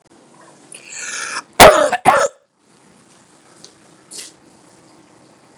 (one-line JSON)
{"cough_length": "5.6 s", "cough_amplitude": 32768, "cough_signal_mean_std_ratio": 0.27, "survey_phase": "beta (2021-08-13 to 2022-03-07)", "age": "45-64", "gender": "Male", "wearing_mask": "No", "symptom_cough_any": true, "symptom_sore_throat": true, "symptom_onset": "3 days", "smoker_status": "Ex-smoker", "respiratory_condition_asthma": false, "respiratory_condition_other": false, "recruitment_source": "Test and Trace", "submission_delay": "2 days", "covid_test_result": "Positive", "covid_test_method": "RT-qPCR", "covid_ct_value": 28.4, "covid_ct_gene": "N gene", "covid_ct_mean": 28.6, "covid_viral_load": "430 copies/ml", "covid_viral_load_category": "Minimal viral load (< 10K copies/ml)"}